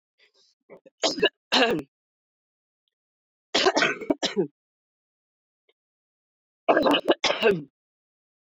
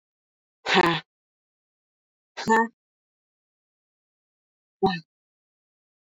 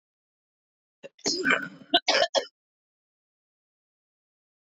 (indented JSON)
{
  "three_cough_length": "8.5 s",
  "three_cough_amplitude": 15092,
  "three_cough_signal_mean_std_ratio": 0.36,
  "exhalation_length": "6.1 s",
  "exhalation_amplitude": 14250,
  "exhalation_signal_mean_std_ratio": 0.25,
  "cough_length": "4.6 s",
  "cough_amplitude": 14512,
  "cough_signal_mean_std_ratio": 0.3,
  "survey_phase": "beta (2021-08-13 to 2022-03-07)",
  "age": "45-64",
  "gender": "Female",
  "wearing_mask": "No",
  "symptom_cough_any": true,
  "symptom_new_continuous_cough": true,
  "symptom_abdominal_pain": true,
  "symptom_fever_high_temperature": true,
  "symptom_headache": true,
  "symptom_change_to_sense_of_smell_or_taste": true,
  "symptom_loss_of_taste": true,
  "symptom_onset": "3 days",
  "smoker_status": "Current smoker (1 to 10 cigarettes per day)",
  "respiratory_condition_asthma": false,
  "respiratory_condition_other": false,
  "recruitment_source": "Test and Trace",
  "submission_delay": "2 days",
  "covid_test_result": "Positive",
  "covid_test_method": "RT-qPCR",
  "covid_ct_value": 22.3,
  "covid_ct_gene": "ORF1ab gene"
}